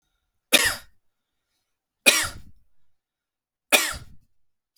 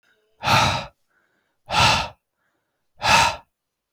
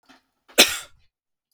{
  "three_cough_length": "4.8 s",
  "three_cough_amplitude": 32767,
  "three_cough_signal_mean_std_ratio": 0.27,
  "exhalation_length": "3.9 s",
  "exhalation_amplitude": 25792,
  "exhalation_signal_mean_std_ratio": 0.42,
  "cough_length": "1.5 s",
  "cough_amplitude": 32768,
  "cough_signal_mean_std_ratio": 0.22,
  "survey_phase": "beta (2021-08-13 to 2022-03-07)",
  "age": "18-44",
  "gender": "Male",
  "wearing_mask": "No",
  "symptom_none": true,
  "smoker_status": "Never smoked",
  "respiratory_condition_asthma": false,
  "respiratory_condition_other": false,
  "recruitment_source": "Test and Trace",
  "submission_delay": "1 day",
  "covid_test_result": "Negative",
  "covid_test_method": "RT-qPCR"
}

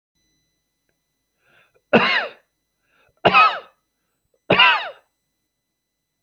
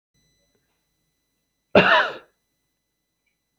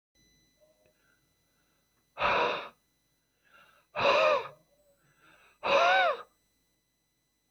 {
  "three_cough_length": "6.2 s",
  "three_cough_amplitude": 28744,
  "three_cough_signal_mean_std_ratio": 0.3,
  "cough_length": "3.6 s",
  "cough_amplitude": 27492,
  "cough_signal_mean_std_ratio": 0.24,
  "exhalation_length": "7.5 s",
  "exhalation_amplitude": 7623,
  "exhalation_signal_mean_std_ratio": 0.36,
  "survey_phase": "beta (2021-08-13 to 2022-03-07)",
  "age": "45-64",
  "gender": "Male",
  "wearing_mask": "No",
  "symptom_cough_any": true,
  "symptom_sore_throat": true,
  "symptom_onset": "7 days",
  "smoker_status": "Never smoked",
  "respiratory_condition_asthma": false,
  "respiratory_condition_other": false,
  "recruitment_source": "REACT",
  "submission_delay": "1 day",
  "covid_test_result": "Negative",
  "covid_test_method": "RT-qPCR"
}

